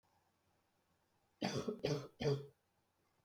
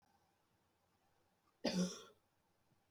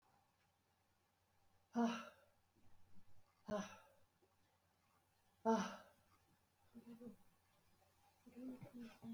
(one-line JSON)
{"three_cough_length": "3.2 s", "three_cough_amplitude": 2343, "three_cough_signal_mean_std_ratio": 0.39, "cough_length": "2.9 s", "cough_amplitude": 1959, "cough_signal_mean_std_ratio": 0.28, "exhalation_length": "9.1 s", "exhalation_amplitude": 1477, "exhalation_signal_mean_std_ratio": 0.32, "survey_phase": "beta (2021-08-13 to 2022-03-07)", "age": "45-64", "gender": "Female", "wearing_mask": "No", "symptom_cough_any": true, "symptom_runny_or_blocked_nose": true, "symptom_sore_throat": true, "symptom_headache": true, "symptom_other": true, "symptom_onset": "2 days", "smoker_status": "Never smoked", "respiratory_condition_asthma": false, "respiratory_condition_other": false, "recruitment_source": "Test and Trace", "submission_delay": "1 day", "covid_test_result": "Positive", "covid_test_method": "RT-qPCR", "covid_ct_value": 17.4, "covid_ct_gene": "ORF1ab gene"}